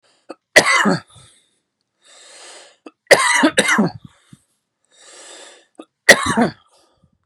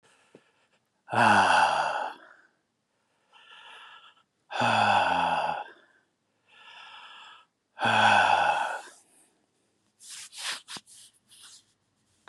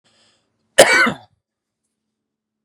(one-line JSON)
{"three_cough_length": "7.3 s", "three_cough_amplitude": 32768, "three_cough_signal_mean_std_ratio": 0.35, "exhalation_length": "12.3 s", "exhalation_amplitude": 14020, "exhalation_signal_mean_std_ratio": 0.43, "cough_length": "2.6 s", "cough_amplitude": 32768, "cough_signal_mean_std_ratio": 0.27, "survey_phase": "beta (2021-08-13 to 2022-03-07)", "age": "45-64", "gender": "Male", "wearing_mask": "No", "symptom_none": true, "smoker_status": "Never smoked", "respiratory_condition_asthma": true, "respiratory_condition_other": false, "recruitment_source": "REACT", "submission_delay": "1 day", "covid_test_result": "Negative", "covid_test_method": "RT-qPCR", "influenza_a_test_result": "Negative", "influenza_b_test_result": "Negative"}